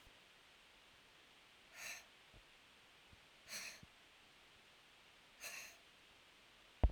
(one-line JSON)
{"exhalation_length": "6.9 s", "exhalation_amplitude": 3203, "exhalation_signal_mean_std_ratio": 0.27, "survey_phase": "alpha (2021-03-01 to 2021-08-12)", "age": "45-64", "gender": "Female", "wearing_mask": "No", "symptom_none": true, "smoker_status": "Never smoked", "respiratory_condition_asthma": false, "respiratory_condition_other": false, "recruitment_source": "REACT", "submission_delay": "1 day", "covid_test_result": "Negative", "covid_test_method": "RT-qPCR"}